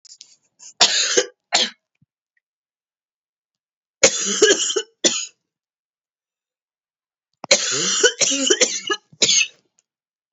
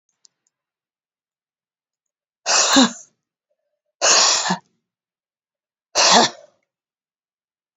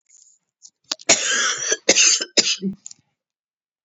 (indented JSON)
{
  "three_cough_length": "10.3 s",
  "three_cough_amplitude": 32768,
  "three_cough_signal_mean_std_ratio": 0.4,
  "exhalation_length": "7.8 s",
  "exhalation_amplitude": 32767,
  "exhalation_signal_mean_std_ratio": 0.33,
  "cough_length": "3.8 s",
  "cough_amplitude": 32768,
  "cough_signal_mean_std_ratio": 0.44,
  "survey_phase": "beta (2021-08-13 to 2022-03-07)",
  "age": "45-64",
  "gender": "Female",
  "wearing_mask": "No",
  "symptom_cough_any": true,
  "symptom_new_continuous_cough": true,
  "symptom_runny_or_blocked_nose": true,
  "symptom_shortness_of_breath": true,
  "symptom_sore_throat": true,
  "symptom_fatigue": true,
  "symptom_headache": true,
  "symptom_onset": "5 days",
  "smoker_status": "Never smoked",
  "respiratory_condition_asthma": true,
  "respiratory_condition_other": false,
  "recruitment_source": "Test and Trace",
  "submission_delay": "1 day",
  "covid_test_result": "Negative",
  "covid_test_method": "RT-qPCR"
}